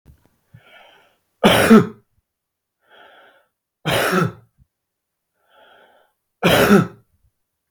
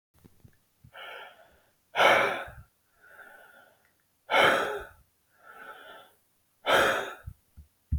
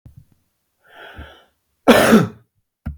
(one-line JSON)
{"three_cough_length": "7.7 s", "three_cough_amplitude": 32428, "three_cough_signal_mean_std_ratio": 0.32, "exhalation_length": "8.0 s", "exhalation_amplitude": 13924, "exhalation_signal_mean_std_ratio": 0.36, "cough_length": "3.0 s", "cough_amplitude": 32706, "cough_signal_mean_std_ratio": 0.32, "survey_phase": "beta (2021-08-13 to 2022-03-07)", "age": "45-64", "gender": "Male", "wearing_mask": "No", "symptom_none": true, "smoker_status": "Never smoked", "respiratory_condition_asthma": false, "respiratory_condition_other": false, "recruitment_source": "REACT", "submission_delay": "1 day", "covid_test_result": "Negative", "covid_test_method": "RT-qPCR", "influenza_a_test_result": "Negative", "influenza_b_test_result": "Negative"}